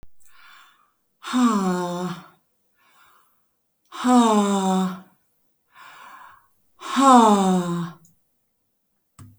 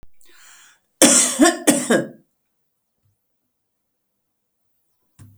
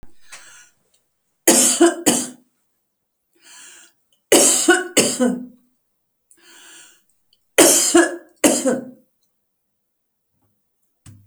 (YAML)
exhalation_length: 9.4 s
exhalation_amplitude: 27362
exhalation_signal_mean_std_ratio: 0.44
cough_length: 5.4 s
cough_amplitude: 32768
cough_signal_mean_std_ratio: 0.31
three_cough_length: 11.3 s
three_cough_amplitude: 32768
three_cough_signal_mean_std_ratio: 0.37
survey_phase: beta (2021-08-13 to 2022-03-07)
age: 45-64
gender: Female
wearing_mask: 'No'
symptom_none: true
smoker_status: Never smoked
respiratory_condition_asthma: false
respiratory_condition_other: false
recruitment_source: REACT
submission_delay: 2 days
covid_test_result: Negative
covid_test_method: RT-qPCR